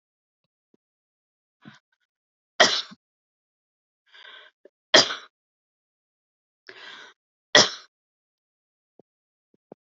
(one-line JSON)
{"three_cough_length": "10.0 s", "three_cough_amplitude": 30596, "three_cough_signal_mean_std_ratio": 0.17, "survey_phase": "beta (2021-08-13 to 2022-03-07)", "age": "18-44", "gender": "Female", "wearing_mask": "No", "symptom_cough_any": true, "symptom_new_continuous_cough": true, "symptom_runny_or_blocked_nose": true, "symptom_shortness_of_breath": true, "symptom_fatigue": true, "symptom_headache": true, "symptom_onset": "4 days", "smoker_status": "Never smoked", "respiratory_condition_asthma": true, "respiratory_condition_other": false, "recruitment_source": "REACT", "submission_delay": "1 day", "covid_test_result": "Positive", "covid_test_method": "RT-qPCR", "covid_ct_value": 18.0, "covid_ct_gene": "E gene", "influenza_a_test_result": "Negative", "influenza_b_test_result": "Negative"}